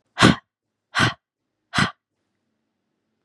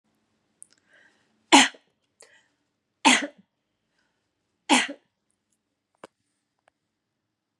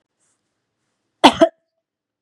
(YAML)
exhalation_length: 3.2 s
exhalation_amplitude: 30569
exhalation_signal_mean_std_ratio: 0.27
three_cough_length: 7.6 s
three_cough_amplitude: 28557
three_cough_signal_mean_std_ratio: 0.19
cough_length: 2.2 s
cough_amplitude: 32768
cough_signal_mean_std_ratio: 0.2
survey_phase: beta (2021-08-13 to 2022-03-07)
age: 18-44
gender: Female
wearing_mask: 'No'
symptom_runny_or_blocked_nose: true
symptom_onset: 3 days
smoker_status: Never smoked
respiratory_condition_asthma: false
respiratory_condition_other: false
recruitment_source: Test and Trace
submission_delay: 2 days
covid_test_result: Positive
covid_test_method: RT-qPCR
covid_ct_value: 23.5
covid_ct_gene: ORF1ab gene
covid_ct_mean: 23.9
covid_viral_load: 15000 copies/ml
covid_viral_load_category: Low viral load (10K-1M copies/ml)